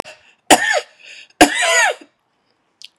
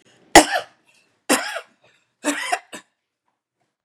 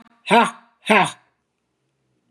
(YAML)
cough_length: 3.0 s
cough_amplitude: 32768
cough_signal_mean_std_ratio: 0.4
three_cough_length: 3.8 s
three_cough_amplitude: 32768
three_cough_signal_mean_std_ratio: 0.26
exhalation_length: 2.3 s
exhalation_amplitude: 32347
exhalation_signal_mean_std_ratio: 0.33
survey_phase: beta (2021-08-13 to 2022-03-07)
age: 45-64
gender: Female
wearing_mask: 'No'
symptom_none: true
smoker_status: Never smoked
respiratory_condition_asthma: false
respiratory_condition_other: false
recruitment_source: REACT
submission_delay: 5 days
covid_test_result: Negative
covid_test_method: RT-qPCR
influenza_a_test_result: Unknown/Void
influenza_b_test_result: Unknown/Void